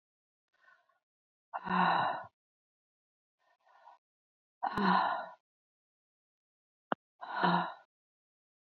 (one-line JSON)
{"exhalation_length": "8.7 s", "exhalation_amplitude": 8028, "exhalation_signal_mean_std_ratio": 0.34, "survey_phase": "beta (2021-08-13 to 2022-03-07)", "age": "45-64", "gender": "Female", "wearing_mask": "No", "symptom_none": true, "smoker_status": "Current smoker (1 to 10 cigarettes per day)", "respiratory_condition_asthma": false, "respiratory_condition_other": false, "recruitment_source": "REACT", "submission_delay": "13 days", "covid_test_result": "Negative", "covid_test_method": "RT-qPCR", "influenza_a_test_result": "Negative", "influenza_b_test_result": "Negative"}